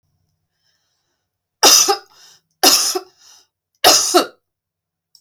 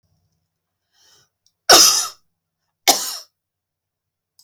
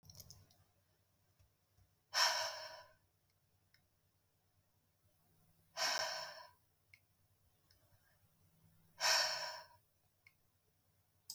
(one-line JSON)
{"three_cough_length": "5.2 s", "three_cough_amplitude": 32768, "three_cough_signal_mean_std_ratio": 0.35, "cough_length": "4.4 s", "cough_amplitude": 32768, "cough_signal_mean_std_ratio": 0.26, "exhalation_length": "11.3 s", "exhalation_amplitude": 3149, "exhalation_signal_mean_std_ratio": 0.31, "survey_phase": "beta (2021-08-13 to 2022-03-07)", "age": "45-64", "gender": "Female", "wearing_mask": "No", "symptom_none": true, "smoker_status": "Never smoked", "respiratory_condition_asthma": false, "respiratory_condition_other": false, "recruitment_source": "REACT", "submission_delay": "2 days", "covid_test_result": "Negative", "covid_test_method": "RT-qPCR", "influenza_a_test_result": "Negative", "influenza_b_test_result": "Negative"}